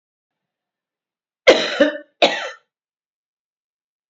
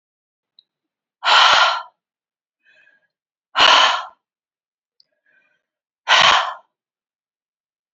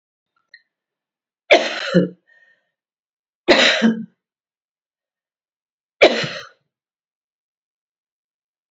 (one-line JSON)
{"cough_length": "4.1 s", "cough_amplitude": 29275, "cough_signal_mean_std_ratio": 0.27, "exhalation_length": "7.9 s", "exhalation_amplitude": 31412, "exhalation_signal_mean_std_ratio": 0.33, "three_cough_length": "8.7 s", "three_cough_amplitude": 30763, "three_cough_signal_mean_std_ratio": 0.28, "survey_phase": "alpha (2021-03-01 to 2021-08-12)", "age": "45-64", "gender": "Female", "wearing_mask": "No", "symptom_none": true, "smoker_status": "Never smoked", "respiratory_condition_asthma": false, "respiratory_condition_other": false, "recruitment_source": "REACT", "submission_delay": "1 day", "covid_test_result": "Negative", "covid_test_method": "RT-qPCR"}